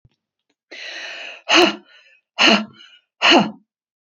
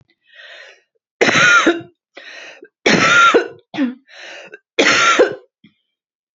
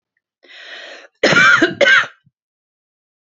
{"exhalation_length": "4.1 s", "exhalation_amplitude": 31288, "exhalation_signal_mean_std_ratio": 0.38, "three_cough_length": "6.4 s", "three_cough_amplitude": 32767, "three_cough_signal_mean_std_ratio": 0.48, "cough_length": "3.2 s", "cough_amplitude": 32767, "cough_signal_mean_std_ratio": 0.41, "survey_phase": "beta (2021-08-13 to 2022-03-07)", "age": "45-64", "gender": "Female", "wearing_mask": "No", "symptom_cough_any": true, "symptom_runny_or_blocked_nose": true, "symptom_fatigue": true, "symptom_onset": "12 days", "smoker_status": "Never smoked", "respiratory_condition_asthma": false, "respiratory_condition_other": false, "recruitment_source": "REACT", "submission_delay": "1 day", "covid_test_result": "Negative", "covid_test_method": "RT-qPCR", "influenza_a_test_result": "Negative", "influenza_b_test_result": "Negative"}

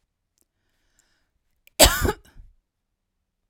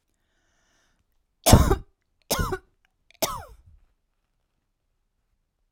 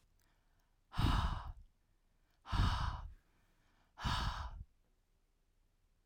{"cough_length": "3.5 s", "cough_amplitude": 32768, "cough_signal_mean_std_ratio": 0.21, "three_cough_length": "5.7 s", "three_cough_amplitude": 32768, "three_cough_signal_mean_std_ratio": 0.23, "exhalation_length": "6.1 s", "exhalation_amplitude": 3140, "exhalation_signal_mean_std_ratio": 0.43, "survey_phase": "alpha (2021-03-01 to 2021-08-12)", "age": "45-64", "gender": "Female", "wearing_mask": "No", "symptom_none": true, "smoker_status": "Never smoked", "respiratory_condition_asthma": false, "respiratory_condition_other": false, "recruitment_source": "REACT", "submission_delay": "2 days", "covid_test_result": "Negative", "covid_test_method": "RT-qPCR"}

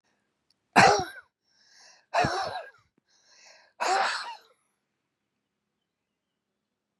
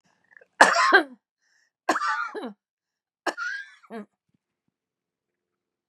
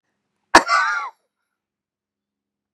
{"exhalation_length": "7.0 s", "exhalation_amplitude": 19380, "exhalation_signal_mean_std_ratio": 0.29, "three_cough_length": "5.9 s", "three_cough_amplitude": 31766, "three_cough_signal_mean_std_ratio": 0.3, "cough_length": "2.7 s", "cough_amplitude": 32768, "cough_signal_mean_std_ratio": 0.26, "survey_phase": "beta (2021-08-13 to 2022-03-07)", "age": "65+", "gender": "Female", "wearing_mask": "No", "symptom_cough_any": true, "symptom_shortness_of_breath": true, "smoker_status": "Ex-smoker", "respiratory_condition_asthma": false, "respiratory_condition_other": true, "recruitment_source": "REACT", "submission_delay": "1 day", "covid_test_result": "Negative", "covid_test_method": "RT-qPCR", "influenza_a_test_result": "Negative", "influenza_b_test_result": "Negative"}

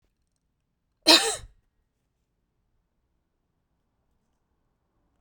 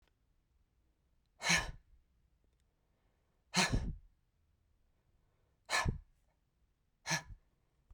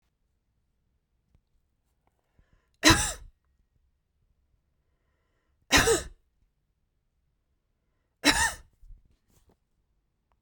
{"cough_length": "5.2 s", "cough_amplitude": 29182, "cough_signal_mean_std_ratio": 0.16, "exhalation_length": "7.9 s", "exhalation_amplitude": 4460, "exhalation_signal_mean_std_ratio": 0.29, "three_cough_length": "10.4 s", "three_cough_amplitude": 24391, "three_cough_signal_mean_std_ratio": 0.22, "survey_phase": "beta (2021-08-13 to 2022-03-07)", "age": "45-64", "gender": "Female", "wearing_mask": "No", "symptom_none": true, "symptom_onset": "5 days", "smoker_status": "Never smoked", "respiratory_condition_asthma": true, "respiratory_condition_other": false, "recruitment_source": "REACT", "submission_delay": "3 days", "covid_test_result": "Negative", "covid_test_method": "RT-qPCR"}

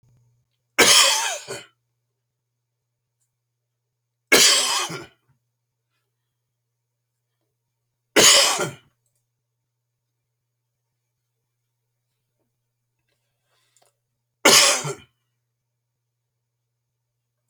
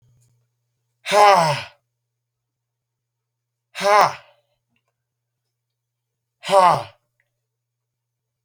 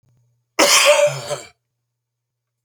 {"three_cough_length": "17.5 s", "three_cough_amplitude": 32768, "three_cough_signal_mean_std_ratio": 0.26, "exhalation_length": "8.4 s", "exhalation_amplitude": 28678, "exhalation_signal_mean_std_ratio": 0.27, "cough_length": "2.6 s", "cough_amplitude": 31321, "cough_signal_mean_std_ratio": 0.42, "survey_phase": "beta (2021-08-13 to 2022-03-07)", "age": "65+", "gender": "Male", "wearing_mask": "Yes", "symptom_cough_any": true, "symptom_fatigue": true, "symptom_headache": true, "smoker_status": "Never smoked", "respiratory_condition_asthma": false, "respiratory_condition_other": false, "recruitment_source": "Test and Trace", "submission_delay": "2 days", "covid_test_result": "Positive", "covid_test_method": "RT-qPCR", "covid_ct_value": 15.4, "covid_ct_gene": "ORF1ab gene", "covid_ct_mean": 15.7, "covid_viral_load": "6900000 copies/ml", "covid_viral_load_category": "High viral load (>1M copies/ml)"}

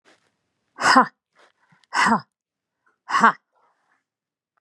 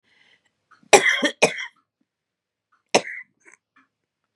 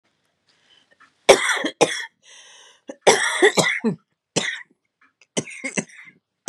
{"exhalation_length": "4.6 s", "exhalation_amplitude": 29715, "exhalation_signal_mean_std_ratio": 0.29, "cough_length": "4.4 s", "cough_amplitude": 32768, "cough_signal_mean_std_ratio": 0.25, "three_cough_length": "6.5 s", "three_cough_amplitude": 32768, "three_cough_signal_mean_std_ratio": 0.36, "survey_phase": "beta (2021-08-13 to 2022-03-07)", "age": "45-64", "gender": "Female", "wearing_mask": "No", "symptom_cough_any": true, "symptom_shortness_of_breath": true, "symptom_fatigue": true, "symptom_onset": "12 days", "smoker_status": "Ex-smoker", "respiratory_condition_asthma": false, "respiratory_condition_other": false, "recruitment_source": "REACT", "submission_delay": "2 days", "covid_test_result": "Negative", "covid_test_method": "RT-qPCR", "influenza_a_test_result": "Negative", "influenza_b_test_result": "Negative"}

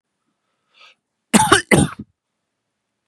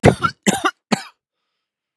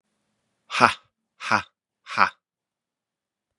{"cough_length": "3.1 s", "cough_amplitude": 32768, "cough_signal_mean_std_ratio": 0.29, "three_cough_length": "2.0 s", "three_cough_amplitude": 32768, "three_cough_signal_mean_std_ratio": 0.33, "exhalation_length": "3.6 s", "exhalation_amplitude": 32766, "exhalation_signal_mean_std_ratio": 0.23, "survey_phase": "beta (2021-08-13 to 2022-03-07)", "age": "18-44", "gender": "Male", "wearing_mask": "No", "symptom_none": true, "smoker_status": "Never smoked", "respiratory_condition_asthma": false, "respiratory_condition_other": false, "recruitment_source": "REACT", "submission_delay": "1 day", "covid_test_result": "Negative", "covid_test_method": "RT-qPCR"}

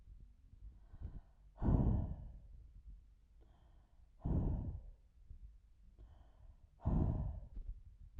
{"exhalation_length": "8.2 s", "exhalation_amplitude": 3293, "exhalation_signal_mean_std_ratio": 0.48, "survey_phase": "beta (2021-08-13 to 2022-03-07)", "age": "45-64", "gender": "Female", "wearing_mask": "No", "symptom_none": true, "smoker_status": "Never smoked", "respiratory_condition_asthma": false, "respiratory_condition_other": false, "recruitment_source": "REACT", "submission_delay": "2 days", "covid_test_result": "Negative", "covid_test_method": "RT-qPCR"}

